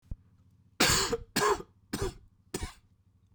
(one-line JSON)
{"cough_length": "3.3 s", "cough_amplitude": 9765, "cough_signal_mean_std_ratio": 0.43, "survey_phase": "beta (2021-08-13 to 2022-03-07)", "age": "45-64", "gender": "Male", "wearing_mask": "No", "symptom_cough_any": true, "symptom_runny_or_blocked_nose": true, "symptom_shortness_of_breath": true, "symptom_sore_throat": true, "symptom_fatigue": true, "symptom_fever_high_temperature": true, "symptom_headache": true, "symptom_change_to_sense_of_smell_or_taste": true, "symptom_other": true, "smoker_status": "Never smoked", "respiratory_condition_asthma": true, "respiratory_condition_other": false, "recruitment_source": "Test and Trace", "submission_delay": "1 day", "covid_test_result": "Positive", "covid_test_method": "RT-qPCR"}